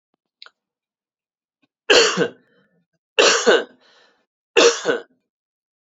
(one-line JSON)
{"three_cough_length": "5.8 s", "three_cough_amplitude": 32767, "three_cough_signal_mean_std_ratio": 0.34, "survey_phase": "beta (2021-08-13 to 2022-03-07)", "age": "45-64", "gender": "Male", "wearing_mask": "No", "symptom_cough_any": true, "symptom_runny_or_blocked_nose": true, "symptom_fatigue": true, "symptom_headache": true, "symptom_other": true, "symptom_onset": "2 days", "smoker_status": "Never smoked", "respiratory_condition_asthma": false, "respiratory_condition_other": false, "recruitment_source": "Test and Trace", "submission_delay": "0 days", "covid_test_result": "Positive", "covid_test_method": "ePCR"}